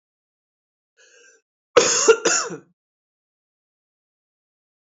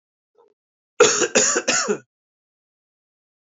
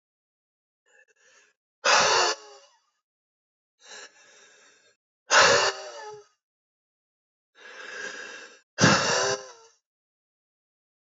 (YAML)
cough_length: 4.9 s
cough_amplitude: 29309
cough_signal_mean_std_ratio: 0.27
three_cough_length: 3.4 s
three_cough_amplitude: 28199
three_cough_signal_mean_std_ratio: 0.38
exhalation_length: 11.2 s
exhalation_amplitude: 17286
exhalation_signal_mean_std_ratio: 0.32
survey_phase: beta (2021-08-13 to 2022-03-07)
age: 18-44
gender: Male
wearing_mask: 'No'
symptom_runny_or_blocked_nose: true
symptom_fatigue: true
symptom_fever_high_temperature: true
symptom_headache: true
symptom_change_to_sense_of_smell_or_taste: true
symptom_onset: 2 days
smoker_status: Ex-smoker
respiratory_condition_asthma: false
respiratory_condition_other: false
recruitment_source: Test and Trace
submission_delay: 1 day
covid_test_result: Positive
covid_test_method: RT-qPCR
covid_ct_value: 24.5
covid_ct_gene: ORF1ab gene
covid_ct_mean: 25.4
covid_viral_load: 4600 copies/ml
covid_viral_load_category: Minimal viral load (< 10K copies/ml)